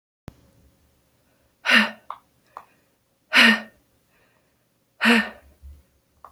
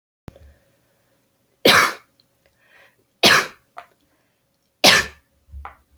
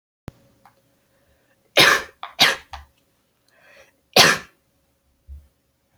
{"exhalation_length": "6.3 s", "exhalation_amplitude": 28679, "exhalation_signal_mean_std_ratio": 0.28, "three_cough_length": "6.0 s", "three_cough_amplitude": 32767, "three_cough_signal_mean_std_ratio": 0.28, "cough_length": "6.0 s", "cough_amplitude": 31081, "cough_signal_mean_std_ratio": 0.26, "survey_phase": "alpha (2021-03-01 to 2021-08-12)", "age": "18-44", "gender": "Female", "wearing_mask": "No", "symptom_headache": true, "smoker_status": "Never smoked", "respiratory_condition_asthma": false, "respiratory_condition_other": false, "recruitment_source": "REACT", "submission_delay": "18 days", "covid_test_result": "Negative", "covid_test_method": "RT-qPCR"}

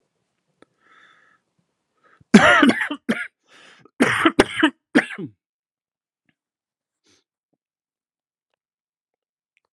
{"cough_length": "9.7 s", "cough_amplitude": 32768, "cough_signal_mean_std_ratio": 0.26, "survey_phase": "alpha (2021-03-01 to 2021-08-12)", "age": "18-44", "gender": "Male", "wearing_mask": "No", "symptom_cough_any": true, "symptom_fever_high_temperature": true, "symptom_headache": true, "symptom_onset": "4 days", "smoker_status": "Ex-smoker", "respiratory_condition_asthma": false, "respiratory_condition_other": false, "recruitment_source": "Test and Trace", "submission_delay": "2 days", "covid_test_result": "Positive", "covid_test_method": "RT-qPCR", "covid_ct_value": 15.2, "covid_ct_gene": "N gene", "covid_ct_mean": 15.3, "covid_viral_load": "9700000 copies/ml", "covid_viral_load_category": "High viral load (>1M copies/ml)"}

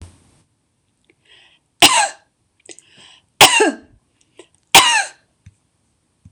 {"three_cough_length": "6.3 s", "three_cough_amplitude": 26028, "three_cough_signal_mean_std_ratio": 0.29, "survey_phase": "beta (2021-08-13 to 2022-03-07)", "age": "45-64", "gender": "Female", "wearing_mask": "No", "symptom_none": true, "smoker_status": "Never smoked", "respiratory_condition_asthma": true, "respiratory_condition_other": false, "recruitment_source": "REACT", "submission_delay": "1 day", "covid_test_result": "Negative", "covid_test_method": "RT-qPCR", "influenza_a_test_result": "Negative", "influenza_b_test_result": "Negative"}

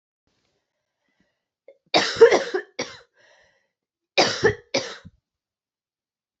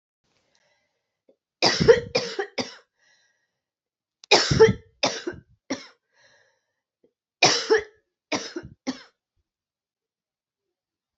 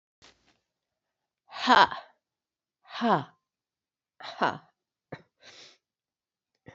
{"cough_length": "6.4 s", "cough_amplitude": 27512, "cough_signal_mean_std_ratio": 0.27, "three_cough_length": "11.2 s", "three_cough_amplitude": 25977, "three_cough_signal_mean_std_ratio": 0.28, "exhalation_length": "6.7 s", "exhalation_amplitude": 16962, "exhalation_signal_mean_std_ratio": 0.23, "survey_phase": "beta (2021-08-13 to 2022-03-07)", "age": "45-64", "gender": "Female", "wearing_mask": "No", "symptom_cough_any": true, "symptom_runny_or_blocked_nose": true, "symptom_fatigue": true, "symptom_fever_high_temperature": true, "symptom_headache": true, "symptom_other": true, "symptom_onset": "4 days", "smoker_status": "Never smoked", "respiratory_condition_asthma": false, "respiratory_condition_other": false, "recruitment_source": "Test and Trace", "submission_delay": "3 days", "covid_test_result": "Positive", "covid_test_method": "ePCR"}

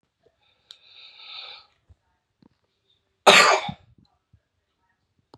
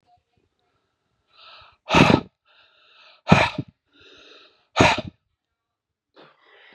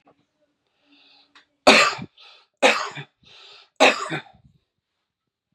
{"cough_length": "5.4 s", "cough_amplitude": 32016, "cough_signal_mean_std_ratio": 0.22, "exhalation_length": "6.7 s", "exhalation_amplitude": 32768, "exhalation_signal_mean_std_ratio": 0.26, "three_cough_length": "5.5 s", "three_cough_amplitude": 32768, "three_cough_signal_mean_std_ratio": 0.28, "survey_phase": "beta (2021-08-13 to 2022-03-07)", "age": "18-44", "gender": "Male", "wearing_mask": "No", "symptom_none": true, "smoker_status": "Current smoker (11 or more cigarettes per day)", "respiratory_condition_asthma": false, "respiratory_condition_other": false, "recruitment_source": "REACT", "submission_delay": "0 days", "covid_test_result": "Negative", "covid_test_method": "RT-qPCR"}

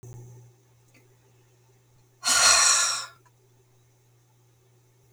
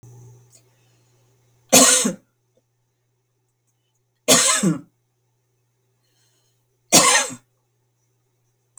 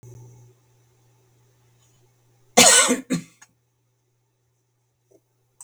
{"exhalation_length": "5.1 s", "exhalation_amplitude": 19304, "exhalation_signal_mean_std_ratio": 0.34, "three_cough_length": "8.8 s", "three_cough_amplitude": 32768, "three_cough_signal_mean_std_ratio": 0.29, "cough_length": "5.6 s", "cough_amplitude": 32768, "cough_signal_mean_std_ratio": 0.23, "survey_phase": "beta (2021-08-13 to 2022-03-07)", "age": "65+", "gender": "Female", "wearing_mask": "No", "symptom_none": true, "smoker_status": "Never smoked", "respiratory_condition_asthma": false, "respiratory_condition_other": false, "recruitment_source": "REACT", "submission_delay": "4 days", "covid_test_result": "Negative", "covid_test_method": "RT-qPCR", "influenza_a_test_result": "Negative", "influenza_b_test_result": "Negative"}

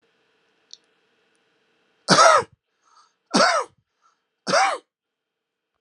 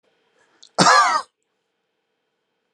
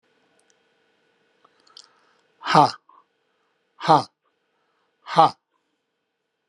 {"three_cough_length": "5.8 s", "three_cough_amplitude": 31125, "three_cough_signal_mean_std_ratio": 0.31, "cough_length": "2.7 s", "cough_amplitude": 30244, "cough_signal_mean_std_ratio": 0.32, "exhalation_length": "6.5 s", "exhalation_amplitude": 30856, "exhalation_signal_mean_std_ratio": 0.22, "survey_phase": "alpha (2021-03-01 to 2021-08-12)", "age": "65+", "gender": "Male", "wearing_mask": "No", "symptom_none": true, "smoker_status": "Never smoked", "respiratory_condition_asthma": false, "respiratory_condition_other": false, "recruitment_source": "REACT", "submission_delay": "1 day", "covid_test_result": "Negative", "covid_test_method": "RT-qPCR"}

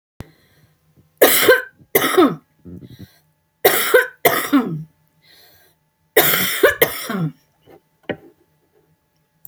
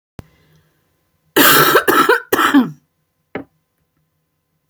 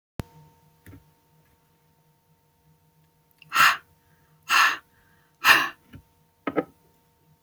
{"three_cough_length": "9.5 s", "three_cough_amplitude": 32768, "three_cough_signal_mean_std_ratio": 0.4, "cough_length": "4.7 s", "cough_amplitude": 32768, "cough_signal_mean_std_ratio": 0.41, "exhalation_length": "7.4 s", "exhalation_amplitude": 24359, "exhalation_signal_mean_std_ratio": 0.26, "survey_phase": "beta (2021-08-13 to 2022-03-07)", "age": "45-64", "gender": "Female", "wearing_mask": "No", "symptom_cough_any": true, "symptom_runny_or_blocked_nose": true, "symptom_shortness_of_breath": true, "symptom_onset": "2 days", "smoker_status": "Never smoked", "respiratory_condition_asthma": true, "respiratory_condition_other": false, "recruitment_source": "Test and Trace", "submission_delay": "1 day", "covid_test_result": "Negative", "covid_test_method": "RT-qPCR"}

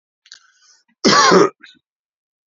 {"cough_length": "2.5 s", "cough_amplitude": 31871, "cough_signal_mean_std_ratio": 0.36, "survey_phase": "beta (2021-08-13 to 2022-03-07)", "age": "65+", "gender": "Male", "wearing_mask": "No", "symptom_cough_any": true, "symptom_runny_or_blocked_nose": true, "smoker_status": "Never smoked", "respiratory_condition_asthma": false, "respiratory_condition_other": false, "recruitment_source": "Test and Trace", "submission_delay": "2 days", "covid_test_result": "Positive", "covid_test_method": "LFT"}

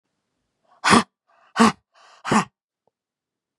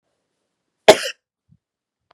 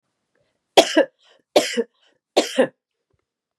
{"exhalation_length": "3.6 s", "exhalation_amplitude": 32705, "exhalation_signal_mean_std_ratio": 0.28, "cough_length": "2.1 s", "cough_amplitude": 32768, "cough_signal_mean_std_ratio": 0.16, "three_cough_length": "3.6 s", "three_cough_amplitude": 32768, "three_cough_signal_mean_std_ratio": 0.3, "survey_phase": "beta (2021-08-13 to 2022-03-07)", "age": "45-64", "gender": "Female", "wearing_mask": "No", "symptom_none": true, "smoker_status": "Ex-smoker", "respiratory_condition_asthma": false, "respiratory_condition_other": false, "recruitment_source": "REACT", "submission_delay": "2 days", "covid_test_result": "Negative", "covid_test_method": "RT-qPCR", "influenza_a_test_result": "Negative", "influenza_b_test_result": "Negative"}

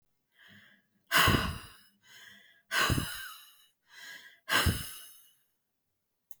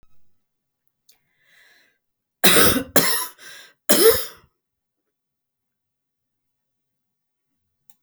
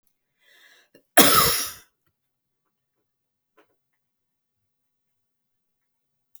{"exhalation_length": "6.4 s", "exhalation_amplitude": 8813, "exhalation_signal_mean_std_ratio": 0.37, "three_cough_length": "8.0 s", "three_cough_amplitude": 32768, "three_cough_signal_mean_std_ratio": 0.28, "cough_length": "6.4 s", "cough_amplitude": 32768, "cough_signal_mean_std_ratio": 0.2, "survey_phase": "beta (2021-08-13 to 2022-03-07)", "age": "65+", "gender": "Female", "wearing_mask": "No", "symptom_none": true, "smoker_status": "Never smoked", "respiratory_condition_asthma": false, "respiratory_condition_other": false, "recruitment_source": "REACT", "submission_delay": "1 day", "covid_test_result": "Negative", "covid_test_method": "RT-qPCR", "influenza_a_test_result": "Negative", "influenza_b_test_result": "Negative"}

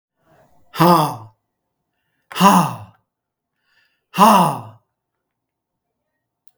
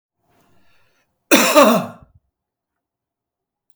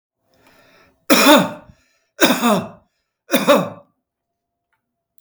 {"exhalation_length": "6.6 s", "exhalation_amplitude": 32766, "exhalation_signal_mean_std_ratio": 0.32, "cough_length": "3.8 s", "cough_amplitude": 32768, "cough_signal_mean_std_ratio": 0.3, "three_cough_length": "5.2 s", "three_cough_amplitude": 32768, "three_cough_signal_mean_std_ratio": 0.37, "survey_phase": "beta (2021-08-13 to 2022-03-07)", "age": "65+", "gender": "Male", "wearing_mask": "No", "symptom_none": true, "symptom_onset": "4 days", "smoker_status": "Never smoked", "respiratory_condition_asthma": false, "respiratory_condition_other": false, "recruitment_source": "REACT", "submission_delay": "1 day", "covid_test_result": "Negative", "covid_test_method": "RT-qPCR"}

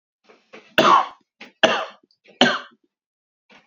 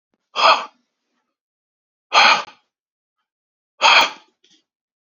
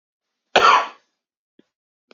{"three_cough_length": "3.7 s", "three_cough_amplitude": 32768, "three_cough_signal_mean_std_ratio": 0.33, "exhalation_length": "5.1 s", "exhalation_amplitude": 31958, "exhalation_signal_mean_std_ratio": 0.31, "cough_length": "2.1 s", "cough_amplitude": 29547, "cough_signal_mean_std_ratio": 0.29, "survey_phase": "beta (2021-08-13 to 2022-03-07)", "age": "18-44", "gender": "Male", "wearing_mask": "No", "symptom_cough_any": true, "symptom_runny_or_blocked_nose": true, "smoker_status": "Never smoked", "respiratory_condition_asthma": false, "respiratory_condition_other": false, "recruitment_source": "Test and Trace", "submission_delay": "1 day", "covid_test_result": "Positive", "covid_test_method": "RT-qPCR", "covid_ct_value": 22.9, "covid_ct_gene": "ORF1ab gene"}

